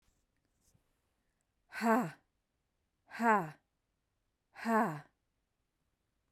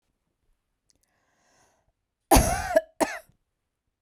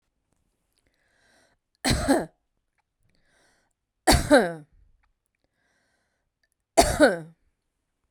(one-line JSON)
{"exhalation_length": "6.3 s", "exhalation_amplitude": 5048, "exhalation_signal_mean_std_ratio": 0.3, "cough_length": "4.0 s", "cough_amplitude": 20365, "cough_signal_mean_std_ratio": 0.26, "three_cough_length": "8.1 s", "three_cough_amplitude": 24555, "three_cough_signal_mean_std_ratio": 0.28, "survey_phase": "beta (2021-08-13 to 2022-03-07)", "age": "45-64", "gender": "Female", "wearing_mask": "No", "symptom_sore_throat": true, "symptom_abdominal_pain": true, "symptom_headache": true, "symptom_other": true, "symptom_onset": "2 days", "smoker_status": "Ex-smoker", "respiratory_condition_asthma": false, "respiratory_condition_other": false, "recruitment_source": "Test and Trace", "submission_delay": "2 days", "covid_test_result": "Positive", "covid_test_method": "RT-qPCR", "covid_ct_value": 25.2, "covid_ct_gene": "N gene", "covid_ct_mean": 25.2, "covid_viral_load": "5500 copies/ml", "covid_viral_load_category": "Minimal viral load (< 10K copies/ml)"}